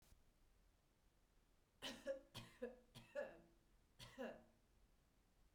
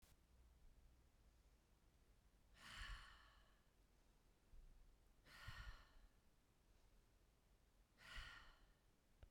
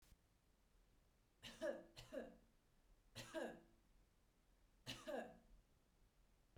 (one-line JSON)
{"cough_length": "5.5 s", "cough_amplitude": 446, "cough_signal_mean_std_ratio": 0.44, "exhalation_length": "9.3 s", "exhalation_amplitude": 231, "exhalation_signal_mean_std_ratio": 0.62, "three_cough_length": "6.6 s", "three_cough_amplitude": 576, "three_cough_signal_mean_std_ratio": 0.43, "survey_phase": "beta (2021-08-13 to 2022-03-07)", "age": "45-64", "gender": "Female", "wearing_mask": "No", "symptom_none": true, "smoker_status": "Never smoked", "respiratory_condition_asthma": false, "respiratory_condition_other": false, "recruitment_source": "REACT", "submission_delay": "2 days", "covid_test_result": "Negative", "covid_test_method": "RT-qPCR", "influenza_a_test_result": "Negative", "influenza_b_test_result": "Negative"}